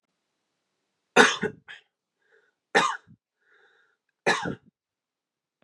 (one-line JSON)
{"three_cough_length": "5.6 s", "three_cough_amplitude": 29142, "three_cough_signal_mean_std_ratio": 0.25, "survey_phase": "beta (2021-08-13 to 2022-03-07)", "age": "18-44", "gender": "Male", "wearing_mask": "No", "symptom_cough_any": true, "symptom_runny_or_blocked_nose": true, "symptom_sore_throat": true, "symptom_onset": "5 days", "smoker_status": "Never smoked", "respiratory_condition_asthma": false, "respiratory_condition_other": false, "recruitment_source": "REACT", "submission_delay": "1 day", "covid_test_result": "Negative", "covid_test_method": "RT-qPCR", "influenza_a_test_result": "Negative", "influenza_b_test_result": "Negative"}